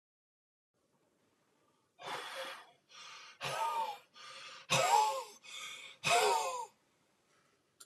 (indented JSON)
{
  "exhalation_length": "7.9 s",
  "exhalation_amplitude": 5567,
  "exhalation_signal_mean_std_ratio": 0.44,
  "survey_phase": "alpha (2021-03-01 to 2021-08-12)",
  "age": "65+",
  "gender": "Male",
  "wearing_mask": "No",
  "symptom_none": true,
  "smoker_status": "Ex-smoker",
  "respiratory_condition_asthma": true,
  "respiratory_condition_other": false,
  "recruitment_source": "REACT",
  "submission_delay": "2 days",
  "covid_test_result": "Negative",
  "covid_test_method": "RT-qPCR"
}